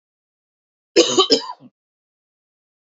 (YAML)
cough_length: 2.8 s
cough_amplitude: 31898
cough_signal_mean_std_ratio: 0.29
survey_phase: beta (2021-08-13 to 2022-03-07)
age: 18-44
gender: Male
wearing_mask: 'No'
symptom_cough_any: true
symptom_sore_throat: true
symptom_onset: 6 days
smoker_status: Never smoked
respiratory_condition_asthma: false
respiratory_condition_other: false
recruitment_source: REACT
submission_delay: 1 day
covid_test_result: Positive
covid_test_method: RT-qPCR
covid_ct_value: 21.8
covid_ct_gene: E gene
influenza_a_test_result: Negative
influenza_b_test_result: Negative